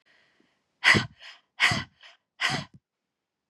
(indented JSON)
{
  "exhalation_length": "3.5 s",
  "exhalation_amplitude": 17879,
  "exhalation_signal_mean_std_ratio": 0.32,
  "survey_phase": "beta (2021-08-13 to 2022-03-07)",
  "age": "45-64",
  "gender": "Female",
  "wearing_mask": "No",
  "symptom_cough_any": true,
  "symptom_runny_or_blocked_nose": true,
  "symptom_fatigue": true,
  "symptom_headache": true,
  "smoker_status": "Ex-smoker",
  "respiratory_condition_asthma": false,
  "respiratory_condition_other": false,
  "recruitment_source": "Test and Trace",
  "submission_delay": "2 days",
  "covid_test_result": "Positive",
  "covid_test_method": "LFT"
}